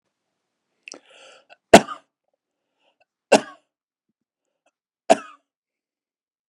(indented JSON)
{
  "three_cough_length": "6.5 s",
  "three_cough_amplitude": 32768,
  "three_cough_signal_mean_std_ratio": 0.13,
  "survey_phase": "beta (2021-08-13 to 2022-03-07)",
  "age": "45-64",
  "gender": "Male",
  "wearing_mask": "No",
  "symptom_fatigue": true,
  "symptom_onset": "12 days",
  "smoker_status": "Ex-smoker",
  "respiratory_condition_asthma": true,
  "respiratory_condition_other": false,
  "recruitment_source": "REACT",
  "submission_delay": "3 days",
  "covid_test_result": "Negative",
  "covid_test_method": "RT-qPCR"
}